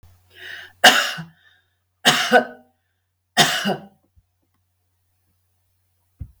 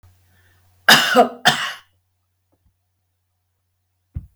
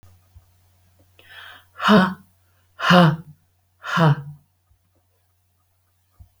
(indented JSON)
{
  "three_cough_length": "6.4 s",
  "three_cough_amplitude": 32768,
  "three_cough_signal_mean_std_ratio": 0.3,
  "cough_length": "4.4 s",
  "cough_amplitude": 32768,
  "cough_signal_mean_std_ratio": 0.28,
  "exhalation_length": "6.4 s",
  "exhalation_amplitude": 28188,
  "exhalation_signal_mean_std_ratio": 0.32,
  "survey_phase": "beta (2021-08-13 to 2022-03-07)",
  "age": "65+",
  "gender": "Female",
  "wearing_mask": "No",
  "symptom_none": true,
  "smoker_status": "Ex-smoker",
  "respiratory_condition_asthma": false,
  "respiratory_condition_other": false,
  "recruitment_source": "REACT",
  "submission_delay": "1 day",
  "covid_test_result": "Negative",
  "covid_test_method": "RT-qPCR"
}